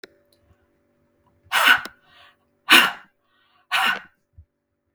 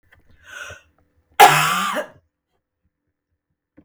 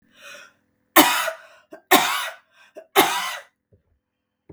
{"exhalation_length": "4.9 s", "exhalation_amplitude": 32768, "exhalation_signal_mean_std_ratio": 0.29, "cough_length": "3.8 s", "cough_amplitude": 32768, "cough_signal_mean_std_ratio": 0.28, "three_cough_length": "4.5 s", "three_cough_amplitude": 32768, "three_cough_signal_mean_std_ratio": 0.35, "survey_phase": "beta (2021-08-13 to 2022-03-07)", "age": "45-64", "gender": "Female", "wearing_mask": "No", "symptom_runny_or_blocked_nose": true, "smoker_status": "Ex-smoker", "respiratory_condition_asthma": true, "respiratory_condition_other": false, "recruitment_source": "REACT", "submission_delay": "2 days", "covid_test_result": "Negative", "covid_test_method": "RT-qPCR"}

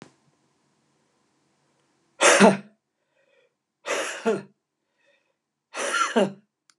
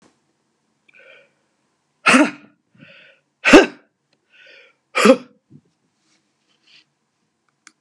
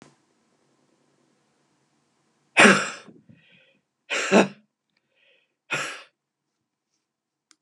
{"cough_length": "6.8 s", "cough_amplitude": 28856, "cough_signal_mean_std_ratio": 0.3, "exhalation_length": "7.8 s", "exhalation_amplitude": 32768, "exhalation_signal_mean_std_ratio": 0.22, "three_cough_length": "7.6 s", "three_cough_amplitude": 30456, "three_cough_signal_mean_std_ratio": 0.23, "survey_phase": "beta (2021-08-13 to 2022-03-07)", "age": "65+", "gender": "Male", "wearing_mask": "No", "symptom_none": true, "smoker_status": "Never smoked", "respiratory_condition_asthma": false, "respiratory_condition_other": false, "recruitment_source": "REACT", "submission_delay": "2 days", "covid_test_result": "Negative", "covid_test_method": "RT-qPCR", "influenza_a_test_result": "Negative", "influenza_b_test_result": "Negative"}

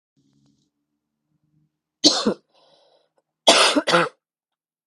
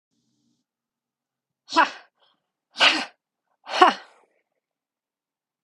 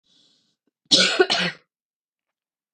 {"three_cough_length": "4.9 s", "three_cough_amplitude": 32768, "three_cough_signal_mean_std_ratio": 0.31, "exhalation_length": "5.6 s", "exhalation_amplitude": 31657, "exhalation_signal_mean_std_ratio": 0.24, "cough_length": "2.7 s", "cough_amplitude": 27937, "cough_signal_mean_std_ratio": 0.34, "survey_phase": "beta (2021-08-13 to 2022-03-07)", "age": "18-44", "gender": "Female", "wearing_mask": "No", "symptom_cough_any": true, "symptom_new_continuous_cough": true, "symptom_runny_or_blocked_nose": true, "symptom_shortness_of_breath": true, "symptom_sore_throat": true, "symptom_abdominal_pain": true, "symptom_diarrhoea": true, "symptom_fatigue": true, "symptom_fever_high_temperature": true, "symptom_headache": true, "symptom_change_to_sense_of_smell_or_taste": true, "symptom_onset": "3 days", "smoker_status": "Current smoker (e-cigarettes or vapes only)", "respiratory_condition_asthma": false, "respiratory_condition_other": false, "recruitment_source": "Test and Trace", "submission_delay": "2 days", "covid_test_result": "Positive", "covid_test_method": "RT-qPCR", "covid_ct_value": 34.6, "covid_ct_gene": "ORF1ab gene"}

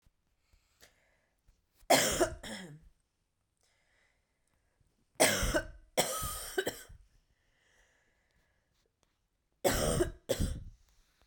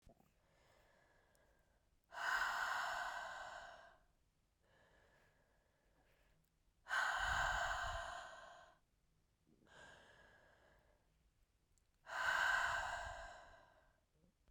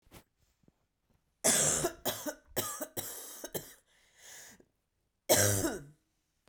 {"three_cough_length": "11.3 s", "three_cough_amplitude": 10108, "three_cough_signal_mean_std_ratio": 0.35, "exhalation_length": "14.5 s", "exhalation_amplitude": 1614, "exhalation_signal_mean_std_ratio": 0.46, "cough_length": "6.5 s", "cough_amplitude": 10749, "cough_signal_mean_std_ratio": 0.4, "survey_phase": "beta (2021-08-13 to 2022-03-07)", "age": "18-44", "gender": "Female", "wearing_mask": "No", "symptom_cough_any": true, "symptom_new_continuous_cough": true, "symptom_runny_or_blocked_nose": true, "symptom_shortness_of_breath": true, "symptom_sore_throat": true, "symptom_fatigue": true, "symptom_onset": "3 days", "smoker_status": "Never smoked", "respiratory_condition_asthma": true, "respiratory_condition_other": false, "recruitment_source": "Test and Trace", "submission_delay": "2 days", "covid_test_result": "Positive", "covid_test_method": "RT-qPCR", "covid_ct_value": 19.2, "covid_ct_gene": "ORF1ab gene", "covid_ct_mean": 19.4, "covid_viral_load": "430000 copies/ml", "covid_viral_load_category": "Low viral load (10K-1M copies/ml)"}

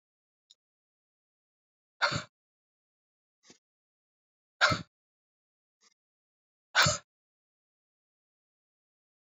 {"exhalation_length": "9.2 s", "exhalation_amplitude": 10526, "exhalation_signal_mean_std_ratio": 0.18, "survey_phase": "beta (2021-08-13 to 2022-03-07)", "age": "45-64", "gender": "Female", "wearing_mask": "No", "symptom_cough_any": true, "symptom_runny_or_blocked_nose": true, "symptom_fatigue": true, "symptom_headache": true, "symptom_change_to_sense_of_smell_or_taste": true, "smoker_status": "Never smoked", "respiratory_condition_asthma": false, "respiratory_condition_other": false, "recruitment_source": "Test and Trace", "submission_delay": "3 days", "covid_test_result": "Positive", "covid_test_method": "LFT"}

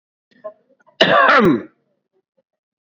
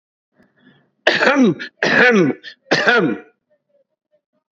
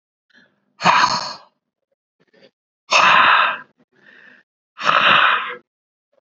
{"cough_length": "2.8 s", "cough_amplitude": 28667, "cough_signal_mean_std_ratio": 0.4, "three_cough_length": "4.5 s", "three_cough_amplitude": 29917, "three_cough_signal_mean_std_ratio": 0.49, "exhalation_length": "6.4 s", "exhalation_amplitude": 29926, "exhalation_signal_mean_std_ratio": 0.43, "survey_phase": "beta (2021-08-13 to 2022-03-07)", "age": "65+", "gender": "Male", "wearing_mask": "No", "symptom_cough_any": true, "symptom_runny_or_blocked_nose": true, "symptom_headache": true, "symptom_onset": "8 days", "smoker_status": "Never smoked", "respiratory_condition_asthma": false, "respiratory_condition_other": false, "recruitment_source": "Test and Trace", "submission_delay": "1 day", "covid_test_result": "Positive", "covid_test_method": "RT-qPCR", "covid_ct_value": 18.3, "covid_ct_gene": "ORF1ab gene", "covid_ct_mean": 18.7, "covid_viral_load": "720000 copies/ml", "covid_viral_load_category": "Low viral load (10K-1M copies/ml)"}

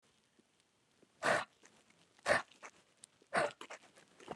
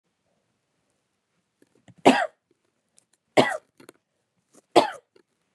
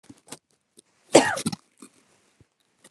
{"exhalation_length": "4.4 s", "exhalation_amplitude": 4249, "exhalation_signal_mean_std_ratio": 0.31, "three_cough_length": "5.5 s", "three_cough_amplitude": 31494, "three_cough_signal_mean_std_ratio": 0.2, "cough_length": "2.9 s", "cough_amplitude": 30348, "cough_signal_mean_std_ratio": 0.21, "survey_phase": "beta (2021-08-13 to 2022-03-07)", "age": "18-44", "gender": "Female", "wearing_mask": "No", "symptom_cough_any": true, "symptom_runny_or_blocked_nose": true, "symptom_fatigue": true, "symptom_headache": true, "symptom_change_to_sense_of_smell_or_taste": true, "smoker_status": "Ex-smoker", "respiratory_condition_asthma": false, "respiratory_condition_other": false, "recruitment_source": "Test and Trace", "submission_delay": "2 days", "covid_test_result": "Positive", "covid_test_method": "RT-qPCR", "covid_ct_value": 12.4, "covid_ct_gene": "ORF1ab gene", "covid_ct_mean": 13.0, "covid_viral_load": "56000000 copies/ml", "covid_viral_load_category": "High viral load (>1M copies/ml)"}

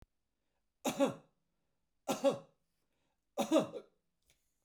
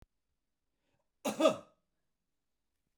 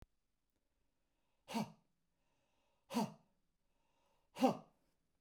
{"three_cough_length": "4.6 s", "three_cough_amplitude": 4294, "three_cough_signal_mean_std_ratio": 0.31, "cough_length": "3.0 s", "cough_amplitude": 7095, "cough_signal_mean_std_ratio": 0.22, "exhalation_length": "5.2 s", "exhalation_amplitude": 3154, "exhalation_signal_mean_std_ratio": 0.23, "survey_phase": "beta (2021-08-13 to 2022-03-07)", "age": "45-64", "gender": "Male", "wearing_mask": "No", "symptom_none": true, "smoker_status": "Never smoked", "respiratory_condition_asthma": false, "respiratory_condition_other": false, "recruitment_source": "REACT", "submission_delay": "1 day", "covid_test_result": "Negative", "covid_test_method": "RT-qPCR"}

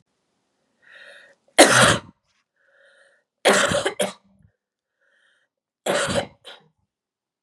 {"three_cough_length": "7.4 s", "three_cough_amplitude": 32768, "three_cough_signal_mean_std_ratio": 0.31, "survey_phase": "beta (2021-08-13 to 2022-03-07)", "age": "45-64", "gender": "Male", "wearing_mask": "No", "symptom_cough_any": true, "symptom_runny_or_blocked_nose": true, "symptom_fatigue": true, "symptom_headache": true, "symptom_other": true, "symptom_onset": "7 days", "smoker_status": "Never smoked", "respiratory_condition_asthma": false, "respiratory_condition_other": false, "recruitment_source": "Test and Trace", "submission_delay": "2 days", "covid_test_result": "Positive", "covid_test_method": "RT-qPCR", "covid_ct_value": 20.3, "covid_ct_gene": "N gene"}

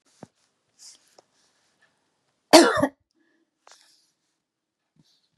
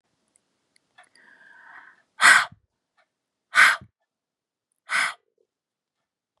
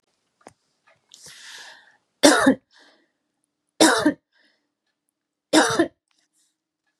{"cough_length": "5.4 s", "cough_amplitude": 32767, "cough_signal_mean_std_ratio": 0.17, "exhalation_length": "6.4 s", "exhalation_amplitude": 29158, "exhalation_signal_mean_std_ratio": 0.24, "three_cough_length": "7.0 s", "three_cough_amplitude": 32768, "three_cough_signal_mean_std_ratio": 0.29, "survey_phase": "beta (2021-08-13 to 2022-03-07)", "age": "18-44", "gender": "Female", "wearing_mask": "No", "symptom_none": true, "smoker_status": "Ex-smoker", "respiratory_condition_asthma": false, "respiratory_condition_other": false, "recruitment_source": "REACT", "submission_delay": "1 day", "covid_test_result": "Negative", "covid_test_method": "RT-qPCR"}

